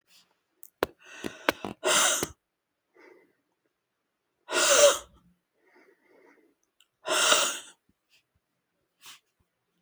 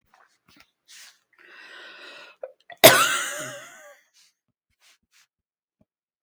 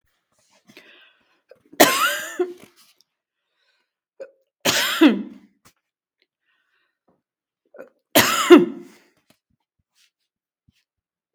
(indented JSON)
{
  "exhalation_length": "9.8 s",
  "exhalation_amplitude": 29193,
  "exhalation_signal_mean_std_ratio": 0.31,
  "cough_length": "6.2 s",
  "cough_amplitude": 32768,
  "cough_signal_mean_std_ratio": 0.21,
  "three_cough_length": "11.3 s",
  "three_cough_amplitude": 32768,
  "three_cough_signal_mean_std_ratio": 0.26,
  "survey_phase": "beta (2021-08-13 to 2022-03-07)",
  "age": "65+",
  "gender": "Female",
  "wearing_mask": "No",
  "symptom_none": true,
  "smoker_status": "Never smoked",
  "respiratory_condition_asthma": false,
  "respiratory_condition_other": false,
  "recruitment_source": "REACT",
  "submission_delay": "2 days",
  "covid_test_result": "Negative",
  "covid_test_method": "RT-qPCR",
  "influenza_a_test_result": "Negative",
  "influenza_b_test_result": "Negative"
}